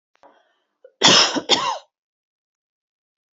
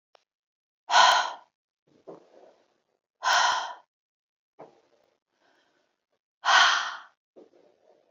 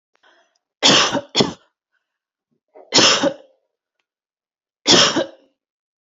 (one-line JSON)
{"cough_length": "3.3 s", "cough_amplitude": 32103, "cough_signal_mean_std_ratio": 0.32, "exhalation_length": "8.1 s", "exhalation_amplitude": 17983, "exhalation_signal_mean_std_ratio": 0.31, "three_cough_length": "6.1 s", "three_cough_amplitude": 32767, "three_cough_signal_mean_std_ratio": 0.36, "survey_phase": "beta (2021-08-13 to 2022-03-07)", "age": "45-64", "gender": "Female", "wearing_mask": "No", "symptom_cough_any": true, "symptom_onset": "3 days", "smoker_status": "Never smoked", "respiratory_condition_asthma": false, "respiratory_condition_other": false, "recruitment_source": "Test and Trace", "submission_delay": "2 days", "covid_test_result": "Positive", "covid_test_method": "RT-qPCR", "covid_ct_value": 25.8, "covid_ct_gene": "ORF1ab gene", "covid_ct_mean": 26.1, "covid_viral_load": "2800 copies/ml", "covid_viral_load_category": "Minimal viral load (< 10K copies/ml)"}